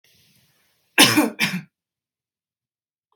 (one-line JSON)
{"cough_length": "3.2 s", "cough_amplitude": 32767, "cough_signal_mean_std_ratio": 0.28, "survey_phase": "beta (2021-08-13 to 2022-03-07)", "age": "18-44", "gender": "Female", "wearing_mask": "No", "symptom_none": true, "symptom_onset": "3 days", "smoker_status": "Never smoked", "respiratory_condition_asthma": false, "respiratory_condition_other": false, "recruitment_source": "REACT", "submission_delay": "1 day", "covid_test_result": "Negative", "covid_test_method": "RT-qPCR", "influenza_a_test_result": "Negative", "influenza_b_test_result": "Negative"}